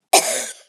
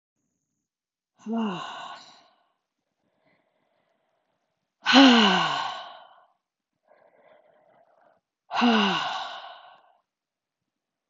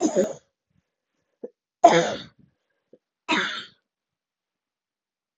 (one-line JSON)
{"cough_length": "0.7 s", "cough_amplitude": 31717, "cough_signal_mean_std_ratio": 0.5, "exhalation_length": "11.1 s", "exhalation_amplitude": 25382, "exhalation_signal_mean_std_ratio": 0.31, "three_cough_length": "5.4 s", "three_cough_amplitude": 29078, "three_cough_signal_mean_std_ratio": 0.28, "survey_phase": "beta (2021-08-13 to 2022-03-07)", "age": "45-64", "gender": "Female", "wearing_mask": "No", "symptom_cough_any": true, "symptom_runny_or_blocked_nose": true, "symptom_fatigue": true, "symptom_other": true, "smoker_status": "Ex-smoker", "respiratory_condition_asthma": false, "respiratory_condition_other": false, "recruitment_source": "Test and Trace", "submission_delay": "3 days", "covid_test_result": "Positive", "covid_test_method": "RT-qPCR", "covid_ct_value": 18.7, "covid_ct_gene": "ORF1ab gene", "covid_ct_mean": 19.1, "covid_viral_load": "560000 copies/ml", "covid_viral_load_category": "Low viral load (10K-1M copies/ml)"}